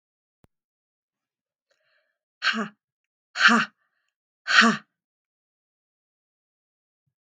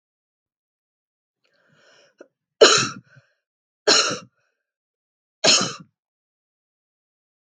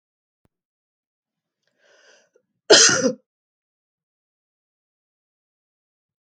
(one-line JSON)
{"exhalation_length": "7.3 s", "exhalation_amplitude": 27776, "exhalation_signal_mean_std_ratio": 0.24, "three_cough_length": "7.5 s", "three_cough_amplitude": 32768, "three_cough_signal_mean_std_ratio": 0.24, "cough_length": "6.2 s", "cough_amplitude": 32768, "cough_signal_mean_std_ratio": 0.19, "survey_phase": "beta (2021-08-13 to 2022-03-07)", "age": "45-64", "gender": "Female", "wearing_mask": "No", "symptom_cough_any": true, "symptom_shortness_of_breath": true, "smoker_status": "Never smoked", "respiratory_condition_asthma": true, "respiratory_condition_other": false, "recruitment_source": "REACT", "submission_delay": "4 days", "covid_test_result": "Negative", "covid_test_method": "RT-qPCR", "influenza_a_test_result": "Negative", "influenza_b_test_result": "Negative"}